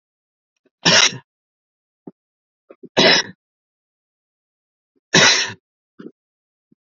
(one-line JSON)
{"three_cough_length": "6.9 s", "three_cough_amplitude": 32527, "three_cough_signal_mean_std_ratio": 0.28, "survey_phase": "beta (2021-08-13 to 2022-03-07)", "age": "65+", "gender": "Male", "wearing_mask": "No", "symptom_fatigue": true, "symptom_onset": "11 days", "smoker_status": "Ex-smoker", "respiratory_condition_asthma": true, "respiratory_condition_other": false, "recruitment_source": "REACT", "submission_delay": "3 days", "covid_test_result": "Negative", "covid_test_method": "RT-qPCR", "influenza_a_test_result": "Negative", "influenza_b_test_result": "Negative"}